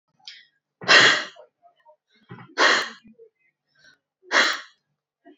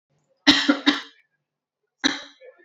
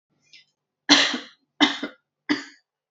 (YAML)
exhalation_length: 5.4 s
exhalation_amplitude: 28927
exhalation_signal_mean_std_ratio: 0.32
cough_length: 2.6 s
cough_amplitude: 27912
cough_signal_mean_std_ratio: 0.33
three_cough_length: 2.9 s
three_cough_amplitude: 31054
three_cough_signal_mean_std_ratio: 0.32
survey_phase: alpha (2021-03-01 to 2021-08-12)
age: 18-44
gender: Female
wearing_mask: 'Yes'
symptom_cough_any: true
symptom_headache: true
smoker_status: Current smoker (11 or more cigarettes per day)
recruitment_source: Test and Trace
submission_delay: 0 days
covid_test_result: Negative
covid_test_method: LFT